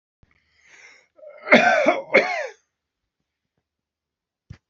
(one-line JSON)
{"cough_length": "4.7 s", "cough_amplitude": 28480, "cough_signal_mean_std_ratio": 0.31, "survey_phase": "beta (2021-08-13 to 2022-03-07)", "age": "65+", "gender": "Male", "wearing_mask": "No", "symptom_none": true, "smoker_status": "Ex-smoker", "respiratory_condition_asthma": false, "respiratory_condition_other": false, "recruitment_source": "REACT", "submission_delay": "2 days", "covid_test_result": "Negative", "covid_test_method": "RT-qPCR"}